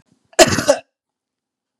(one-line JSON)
{"cough_length": "1.8 s", "cough_amplitude": 32768, "cough_signal_mean_std_ratio": 0.29, "survey_phase": "beta (2021-08-13 to 2022-03-07)", "age": "45-64", "gender": "Female", "wearing_mask": "No", "symptom_none": true, "smoker_status": "Never smoked", "respiratory_condition_asthma": false, "respiratory_condition_other": false, "recruitment_source": "REACT", "submission_delay": "1 day", "covid_test_result": "Negative", "covid_test_method": "RT-qPCR", "influenza_a_test_result": "Negative", "influenza_b_test_result": "Negative"}